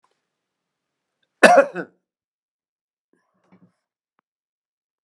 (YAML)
cough_length: 5.0 s
cough_amplitude: 32768
cough_signal_mean_std_ratio: 0.18
survey_phase: beta (2021-08-13 to 2022-03-07)
age: 65+
gender: Male
wearing_mask: 'No'
symptom_none: true
smoker_status: Never smoked
respiratory_condition_asthma: false
respiratory_condition_other: false
recruitment_source: REACT
submission_delay: 1 day
covid_test_result: Negative
covid_test_method: RT-qPCR